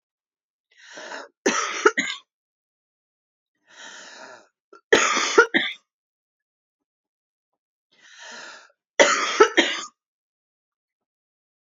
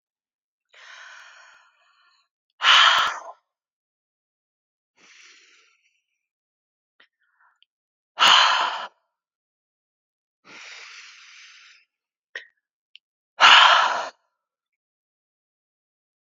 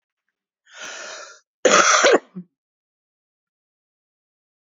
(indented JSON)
{
  "three_cough_length": "11.6 s",
  "three_cough_amplitude": 29674,
  "three_cough_signal_mean_std_ratio": 0.29,
  "exhalation_length": "16.3 s",
  "exhalation_amplitude": 31089,
  "exhalation_signal_mean_std_ratio": 0.26,
  "cough_length": "4.6 s",
  "cough_amplitude": 29880,
  "cough_signal_mean_std_ratio": 0.3,
  "survey_phase": "beta (2021-08-13 to 2022-03-07)",
  "age": "45-64",
  "gender": "Female",
  "wearing_mask": "No",
  "symptom_cough_any": true,
  "symptom_runny_or_blocked_nose": true,
  "symptom_fatigue": true,
  "symptom_headache": true,
  "symptom_change_to_sense_of_smell_or_taste": true,
  "symptom_onset": "6 days",
  "smoker_status": "Current smoker (e-cigarettes or vapes only)",
  "respiratory_condition_asthma": true,
  "respiratory_condition_other": true,
  "recruitment_source": "Test and Trace",
  "submission_delay": "1 day",
  "covid_test_result": "Positive",
  "covid_test_method": "RT-qPCR",
  "covid_ct_value": 11.7,
  "covid_ct_gene": "ORF1ab gene",
  "covid_ct_mean": 11.9,
  "covid_viral_load": "120000000 copies/ml",
  "covid_viral_load_category": "High viral load (>1M copies/ml)"
}